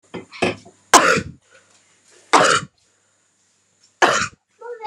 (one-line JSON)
{"three_cough_length": "4.9 s", "three_cough_amplitude": 32768, "three_cough_signal_mean_std_ratio": 0.35, "survey_phase": "beta (2021-08-13 to 2022-03-07)", "age": "18-44", "gender": "Female", "wearing_mask": "No", "symptom_runny_or_blocked_nose": true, "symptom_onset": "4 days", "smoker_status": "Ex-smoker", "respiratory_condition_asthma": false, "respiratory_condition_other": false, "recruitment_source": "REACT", "submission_delay": "0 days", "covid_test_result": "Negative", "covid_test_method": "RT-qPCR"}